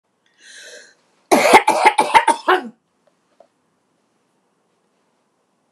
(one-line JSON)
{"cough_length": "5.7 s", "cough_amplitude": 29204, "cough_signal_mean_std_ratio": 0.32, "survey_phase": "beta (2021-08-13 to 2022-03-07)", "age": "65+", "gender": "Female", "wearing_mask": "No", "symptom_runny_or_blocked_nose": true, "smoker_status": "Never smoked", "respiratory_condition_asthma": false, "respiratory_condition_other": false, "recruitment_source": "REACT", "submission_delay": "2 days", "covid_test_result": "Negative", "covid_test_method": "RT-qPCR", "influenza_a_test_result": "Negative", "influenza_b_test_result": "Negative"}